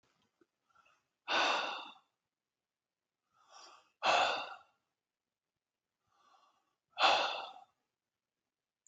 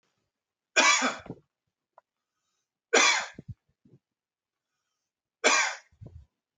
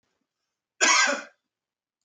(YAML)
exhalation_length: 8.9 s
exhalation_amplitude: 6071
exhalation_signal_mean_std_ratio: 0.31
three_cough_length: 6.6 s
three_cough_amplitude: 14677
three_cough_signal_mean_std_ratio: 0.31
cough_length: 2.0 s
cough_amplitude: 16877
cough_signal_mean_std_ratio: 0.35
survey_phase: beta (2021-08-13 to 2022-03-07)
age: 45-64
gender: Male
wearing_mask: 'No'
symptom_none: true
smoker_status: Never smoked
respiratory_condition_asthma: true
respiratory_condition_other: false
recruitment_source: REACT
submission_delay: 1 day
covid_test_result: Negative
covid_test_method: RT-qPCR